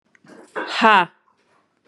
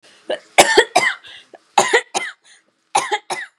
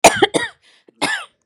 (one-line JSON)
{"exhalation_length": "1.9 s", "exhalation_amplitude": 31652, "exhalation_signal_mean_std_ratio": 0.34, "three_cough_length": "3.6 s", "three_cough_amplitude": 32768, "three_cough_signal_mean_std_ratio": 0.41, "cough_length": "1.5 s", "cough_amplitude": 32768, "cough_signal_mean_std_ratio": 0.39, "survey_phase": "beta (2021-08-13 to 2022-03-07)", "age": "18-44", "gender": "Female", "wearing_mask": "No", "symptom_none": true, "smoker_status": "Current smoker (1 to 10 cigarettes per day)", "respiratory_condition_asthma": false, "respiratory_condition_other": false, "recruitment_source": "REACT", "submission_delay": "1 day", "covid_test_result": "Negative", "covid_test_method": "RT-qPCR", "influenza_a_test_result": "Negative", "influenza_b_test_result": "Negative"}